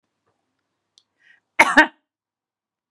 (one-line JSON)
{"cough_length": "2.9 s", "cough_amplitude": 32767, "cough_signal_mean_std_ratio": 0.2, "survey_phase": "beta (2021-08-13 to 2022-03-07)", "age": "45-64", "gender": "Female", "wearing_mask": "No", "symptom_none": true, "smoker_status": "Never smoked", "respiratory_condition_asthma": false, "respiratory_condition_other": false, "recruitment_source": "REACT", "submission_delay": "1 day", "covid_test_result": "Negative", "covid_test_method": "RT-qPCR"}